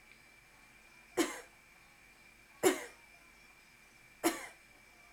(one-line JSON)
{"three_cough_length": "5.1 s", "three_cough_amplitude": 6223, "three_cough_signal_mean_std_ratio": 0.3, "survey_phase": "alpha (2021-03-01 to 2021-08-12)", "age": "18-44", "gender": "Female", "wearing_mask": "No", "symptom_none": true, "smoker_status": "Never smoked", "respiratory_condition_asthma": false, "respiratory_condition_other": false, "recruitment_source": "REACT", "submission_delay": "1 day", "covid_test_result": "Negative", "covid_test_method": "RT-qPCR"}